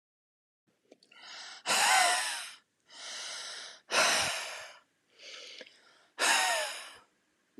{
  "exhalation_length": "7.6 s",
  "exhalation_amplitude": 6991,
  "exhalation_signal_mean_std_ratio": 0.48,
  "survey_phase": "beta (2021-08-13 to 2022-03-07)",
  "age": "18-44",
  "gender": "Female",
  "wearing_mask": "No",
  "symptom_runny_or_blocked_nose": true,
  "symptom_sore_throat": true,
  "symptom_fatigue": true,
  "smoker_status": "Never smoked",
  "respiratory_condition_asthma": false,
  "respiratory_condition_other": false,
  "recruitment_source": "Test and Trace",
  "submission_delay": "2 days",
  "covid_test_result": "Positive",
  "covid_test_method": "LFT"
}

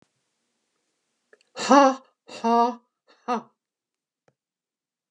{
  "exhalation_length": "5.1 s",
  "exhalation_amplitude": 26144,
  "exhalation_signal_mean_std_ratio": 0.27,
  "survey_phase": "beta (2021-08-13 to 2022-03-07)",
  "age": "45-64",
  "gender": "Female",
  "wearing_mask": "No",
  "symptom_cough_any": true,
  "smoker_status": "Ex-smoker",
  "respiratory_condition_asthma": false,
  "respiratory_condition_other": false,
  "recruitment_source": "REACT",
  "submission_delay": "1 day",
  "covid_test_result": "Negative",
  "covid_test_method": "RT-qPCR",
  "influenza_a_test_result": "Negative",
  "influenza_b_test_result": "Negative"
}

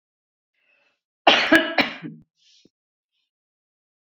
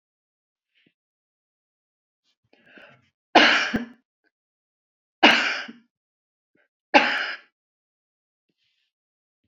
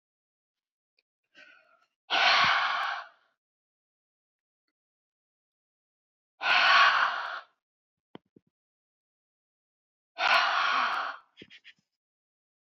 {
  "cough_length": "4.2 s",
  "cough_amplitude": 27988,
  "cough_signal_mean_std_ratio": 0.27,
  "three_cough_length": "9.5 s",
  "three_cough_amplitude": 29468,
  "three_cough_signal_mean_std_ratio": 0.24,
  "exhalation_length": "12.8 s",
  "exhalation_amplitude": 12140,
  "exhalation_signal_mean_std_ratio": 0.36,
  "survey_phase": "beta (2021-08-13 to 2022-03-07)",
  "age": "65+",
  "gender": "Female",
  "wearing_mask": "No",
  "symptom_none": true,
  "smoker_status": "Ex-smoker",
  "respiratory_condition_asthma": true,
  "respiratory_condition_other": false,
  "recruitment_source": "REACT",
  "submission_delay": "3 days",
  "covid_test_result": "Negative",
  "covid_test_method": "RT-qPCR",
  "influenza_a_test_result": "Unknown/Void",
  "influenza_b_test_result": "Unknown/Void"
}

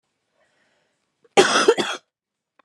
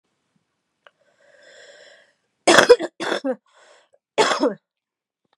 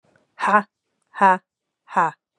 {
  "cough_length": "2.6 s",
  "cough_amplitude": 31569,
  "cough_signal_mean_std_ratio": 0.31,
  "three_cough_length": "5.4 s",
  "three_cough_amplitude": 32768,
  "three_cough_signal_mean_std_ratio": 0.28,
  "exhalation_length": "2.4 s",
  "exhalation_amplitude": 28151,
  "exhalation_signal_mean_std_ratio": 0.35,
  "survey_phase": "beta (2021-08-13 to 2022-03-07)",
  "age": "45-64",
  "gender": "Female",
  "wearing_mask": "No",
  "symptom_cough_any": true,
  "symptom_runny_or_blocked_nose": true,
  "symptom_fatigue": true,
  "symptom_change_to_sense_of_smell_or_taste": true,
  "symptom_other": true,
  "symptom_onset": "3 days",
  "smoker_status": "Prefer not to say",
  "respiratory_condition_asthma": false,
  "respiratory_condition_other": true,
  "recruitment_source": "Test and Trace",
  "submission_delay": "1 day",
  "covid_test_result": "Positive",
  "covid_test_method": "RT-qPCR",
  "covid_ct_value": 21.5,
  "covid_ct_gene": "ORF1ab gene"
}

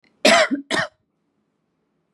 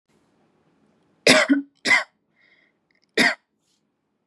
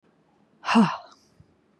{
  "cough_length": "2.1 s",
  "cough_amplitude": 31374,
  "cough_signal_mean_std_ratio": 0.36,
  "three_cough_length": "4.3 s",
  "three_cough_amplitude": 31311,
  "three_cough_signal_mean_std_ratio": 0.31,
  "exhalation_length": "1.8 s",
  "exhalation_amplitude": 13511,
  "exhalation_signal_mean_std_ratio": 0.32,
  "survey_phase": "beta (2021-08-13 to 2022-03-07)",
  "age": "18-44",
  "gender": "Female",
  "wearing_mask": "No",
  "symptom_none": true,
  "smoker_status": "Never smoked",
  "respiratory_condition_asthma": false,
  "respiratory_condition_other": false,
  "recruitment_source": "REACT",
  "submission_delay": "2 days",
  "covid_test_result": "Negative",
  "covid_test_method": "RT-qPCR",
  "influenza_a_test_result": "Unknown/Void",
  "influenza_b_test_result": "Unknown/Void"
}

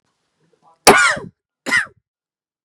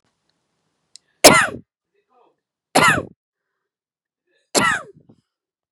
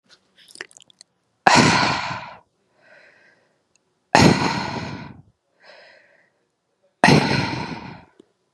{
  "cough_length": "2.6 s",
  "cough_amplitude": 32768,
  "cough_signal_mean_std_ratio": 0.31,
  "three_cough_length": "5.7 s",
  "three_cough_amplitude": 32768,
  "three_cough_signal_mean_std_ratio": 0.26,
  "exhalation_length": "8.5 s",
  "exhalation_amplitude": 32768,
  "exhalation_signal_mean_std_ratio": 0.36,
  "survey_phase": "beta (2021-08-13 to 2022-03-07)",
  "age": "18-44",
  "gender": "Female",
  "wearing_mask": "Yes",
  "symptom_cough_any": true,
  "symptom_shortness_of_breath": true,
  "symptom_sore_throat": true,
  "symptom_fatigue": true,
  "smoker_status": "Ex-smoker",
  "respiratory_condition_asthma": true,
  "respiratory_condition_other": false,
  "recruitment_source": "Test and Trace",
  "submission_delay": "0 days",
  "covid_test_result": "Positive",
  "covid_test_method": "LFT"
}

